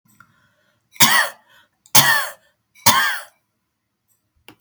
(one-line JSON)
{"three_cough_length": "4.6 s", "three_cough_amplitude": 32768, "three_cough_signal_mean_std_ratio": 0.34, "survey_phase": "beta (2021-08-13 to 2022-03-07)", "age": "65+", "gender": "Female", "wearing_mask": "No", "symptom_none": true, "smoker_status": "Ex-smoker", "respiratory_condition_asthma": true, "respiratory_condition_other": false, "recruitment_source": "REACT", "submission_delay": "3 days", "covid_test_result": "Negative", "covid_test_method": "RT-qPCR", "influenza_a_test_result": "Negative", "influenza_b_test_result": "Negative"}